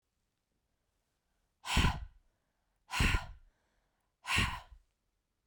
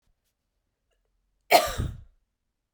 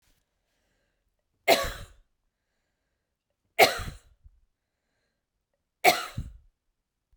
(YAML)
exhalation_length: 5.5 s
exhalation_amplitude: 5541
exhalation_signal_mean_std_ratio: 0.33
cough_length: 2.7 s
cough_amplitude: 22457
cough_signal_mean_std_ratio: 0.24
three_cough_length: 7.2 s
three_cough_amplitude: 21934
three_cough_signal_mean_std_ratio: 0.22
survey_phase: beta (2021-08-13 to 2022-03-07)
age: 45-64
gender: Female
wearing_mask: 'No'
symptom_none: true
smoker_status: Ex-smoker
respiratory_condition_asthma: false
respiratory_condition_other: false
recruitment_source: REACT
submission_delay: 1 day
covid_test_result: Negative
covid_test_method: RT-qPCR
influenza_a_test_result: Negative
influenza_b_test_result: Negative